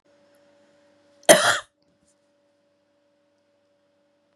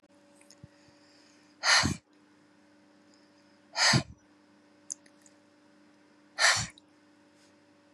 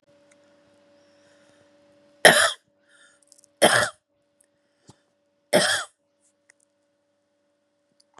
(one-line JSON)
{"cough_length": "4.4 s", "cough_amplitude": 32768, "cough_signal_mean_std_ratio": 0.18, "exhalation_length": "7.9 s", "exhalation_amplitude": 9909, "exhalation_signal_mean_std_ratio": 0.28, "three_cough_length": "8.2 s", "three_cough_amplitude": 32768, "three_cough_signal_mean_std_ratio": 0.23, "survey_phase": "beta (2021-08-13 to 2022-03-07)", "age": "45-64", "gender": "Female", "wearing_mask": "No", "symptom_none": true, "smoker_status": "Ex-smoker", "respiratory_condition_asthma": false, "respiratory_condition_other": false, "recruitment_source": "REACT", "submission_delay": "5 days", "covid_test_result": "Negative", "covid_test_method": "RT-qPCR", "influenza_a_test_result": "Unknown/Void", "influenza_b_test_result": "Unknown/Void"}